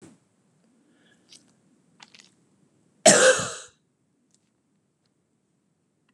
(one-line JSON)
{"cough_length": "6.1 s", "cough_amplitude": 30577, "cough_signal_mean_std_ratio": 0.2, "survey_phase": "beta (2021-08-13 to 2022-03-07)", "age": "45-64", "gender": "Female", "wearing_mask": "No", "symptom_none": true, "smoker_status": "Never smoked", "respiratory_condition_asthma": false, "respiratory_condition_other": false, "recruitment_source": "REACT", "submission_delay": "2 days", "covid_test_result": "Negative", "covid_test_method": "RT-qPCR"}